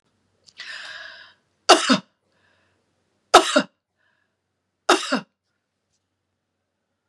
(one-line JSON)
{"three_cough_length": "7.1 s", "three_cough_amplitude": 32768, "three_cough_signal_mean_std_ratio": 0.23, "survey_phase": "beta (2021-08-13 to 2022-03-07)", "age": "45-64", "gender": "Female", "wearing_mask": "No", "symptom_none": true, "smoker_status": "Ex-smoker", "respiratory_condition_asthma": true, "respiratory_condition_other": false, "recruitment_source": "REACT", "submission_delay": "1 day", "covid_test_result": "Negative", "covid_test_method": "RT-qPCR", "influenza_a_test_result": "Negative", "influenza_b_test_result": "Negative"}